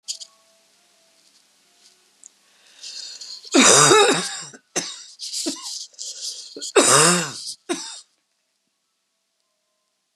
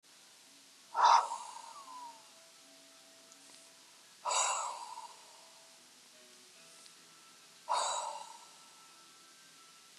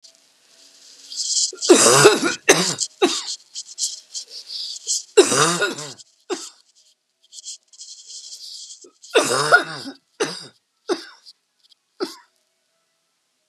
{"cough_length": "10.2 s", "cough_amplitude": 32617, "cough_signal_mean_std_ratio": 0.36, "exhalation_length": "10.0 s", "exhalation_amplitude": 6466, "exhalation_signal_mean_std_ratio": 0.35, "three_cough_length": "13.5 s", "three_cough_amplitude": 32768, "three_cough_signal_mean_std_ratio": 0.39, "survey_phase": "beta (2021-08-13 to 2022-03-07)", "age": "65+", "gender": "Female", "wearing_mask": "No", "symptom_cough_any": true, "symptom_runny_or_blocked_nose": true, "symptom_sore_throat": true, "symptom_fatigue": true, "symptom_headache": true, "symptom_change_to_sense_of_smell_or_taste": true, "symptom_loss_of_taste": true, "symptom_onset": "6 days", "smoker_status": "Never smoked", "respiratory_condition_asthma": false, "respiratory_condition_other": false, "recruitment_source": "Test and Trace", "submission_delay": "3 days", "covid_test_result": "Positive", "covid_test_method": "RT-qPCR", "covid_ct_value": 23.3, "covid_ct_gene": "ORF1ab gene"}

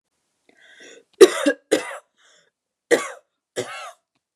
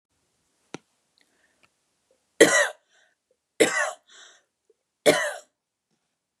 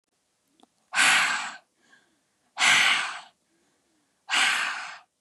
{"cough_length": "4.4 s", "cough_amplitude": 32768, "cough_signal_mean_std_ratio": 0.24, "three_cough_length": "6.4 s", "three_cough_amplitude": 32250, "three_cough_signal_mean_std_ratio": 0.25, "exhalation_length": "5.2 s", "exhalation_amplitude": 13826, "exhalation_signal_mean_std_ratio": 0.46, "survey_phase": "beta (2021-08-13 to 2022-03-07)", "age": "18-44", "gender": "Female", "wearing_mask": "No", "symptom_none": true, "smoker_status": "Never smoked", "respiratory_condition_asthma": false, "respiratory_condition_other": false, "recruitment_source": "REACT", "submission_delay": "2 days", "covid_test_result": "Negative", "covid_test_method": "RT-qPCR", "influenza_a_test_result": "Negative", "influenza_b_test_result": "Negative"}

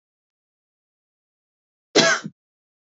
{"cough_length": "2.9 s", "cough_amplitude": 27808, "cough_signal_mean_std_ratio": 0.23, "survey_phase": "alpha (2021-03-01 to 2021-08-12)", "age": "18-44", "gender": "Female", "wearing_mask": "No", "symptom_cough_any": true, "symptom_headache": true, "symptom_onset": "3 days", "smoker_status": "Current smoker (1 to 10 cigarettes per day)", "respiratory_condition_asthma": true, "respiratory_condition_other": false, "recruitment_source": "Test and Trace", "submission_delay": "1 day", "covid_test_result": "Positive", "covid_test_method": "RT-qPCR", "covid_ct_value": 29.1, "covid_ct_gene": "ORF1ab gene", "covid_ct_mean": 29.6, "covid_viral_load": "200 copies/ml", "covid_viral_load_category": "Minimal viral load (< 10K copies/ml)"}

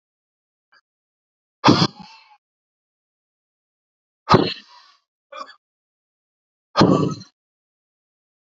{"exhalation_length": "8.4 s", "exhalation_amplitude": 32768, "exhalation_signal_mean_std_ratio": 0.24, "survey_phase": "alpha (2021-03-01 to 2021-08-12)", "age": "45-64", "gender": "Male", "wearing_mask": "No", "symptom_none": true, "smoker_status": "Never smoked", "respiratory_condition_asthma": true, "respiratory_condition_other": false, "recruitment_source": "REACT", "submission_delay": "2 days", "covid_test_result": "Negative", "covid_test_method": "RT-qPCR"}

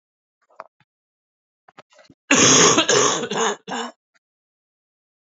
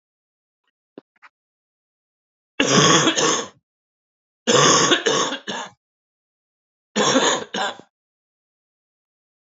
{"cough_length": "5.2 s", "cough_amplitude": 27712, "cough_signal_mean_std_ratio": 0.39, "three_cough_length": "9.6 s", "three_cough_amplitude": 28540, "three_cough_signal_mean_std_ratio": 0.4, "survey_phase": "alpha (2021-03-01 to 2021-08-12)", "age": "18-44", "gender": "Male", "wearing_mask": "No", "symptom_cough_any": true, "symptom_shortness_of_breath": true, "symptom_fatigue": true, "smoker_status": "Never smoked", "respiratory_condition_asthma": false, "respiratory_condition_other": false, "recruitment_source": "Test and Trace", "submission_delay": "2 days", "covid_test_result": "Positive", "covid_test_method": "RT-qPCR", "covid_ct_value": 17.5, "covid_ct_gene": "N gene", "covid_ct_mean": 17.7, "covid_viral_load": "1600000 copies/ml", "covid_viral_load_category": "High viral load (>1M copies/ml)"}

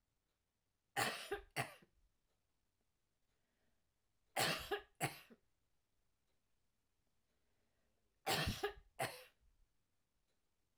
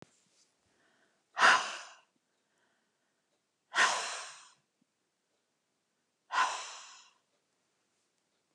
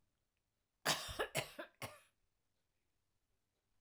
{"three_cough_length": "10.8 s", "three_cough_amplitude": 1964, "three_cough_signal_mean_std_ratio": 0.31, "exhalation_length": "8.5 s", "exhalation_amplitude": 9186, "exhalation_signal_mean_std_ratio": 0.26, "cough_length": "3.8 s", "cough_amplitude": 2256, "cough_signal_mean_std_ratio": 0.3, "survey_phase": "alpha (2021-03-01 to 2021-08-12)", "age": "45-64", "gender": "Female", "wearing_mask": "No", "symptom_none": true, "symptom_onset": "12 days", "smoker_status": "Never smoked", "respiratory_condition_asthma": false, "respiratory_condition_other": false, "recruitment_source": "REACT", "submission_delay": "3 days", "covid_test_result": "Negative", "covid_test_method": "RT-qPCR"}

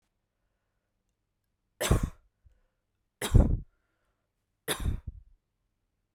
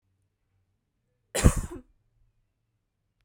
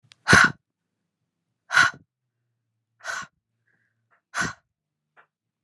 {"three_cough_length": "6.1 s", "three_cough_amplitude": 13975, "three_cough_signal_mean_std_ratio": 0.25, "cough_length": "3.2 s", "cough_amplitude": 20145, "cough_signal_mean_std_ratio": 0.19, "exhalation_length": "5.6 s", "exhalation_amplitude": 30338, "exhalation_signal_mean_std_ratio": 0.24, "survey_phase": "beta (2021-08-13 to 2022-03-07)", "age": "18-44", "gender": "Female", "wearing_mask": "No", "symptom_none": true, "smoker_status": "Current smoker (e-cigarettes or vapes only)", "respiratory_condition_asthma": false, "respiratory_condition_other": false, "recruitment_source": "REACT", "submission_delay": "0 days", "covid_test_result": "Negative", "covid_test_method": "RT-qPCR", "influenza_a_test_result": "Negative", "influenza_b_test_result": "Negative"}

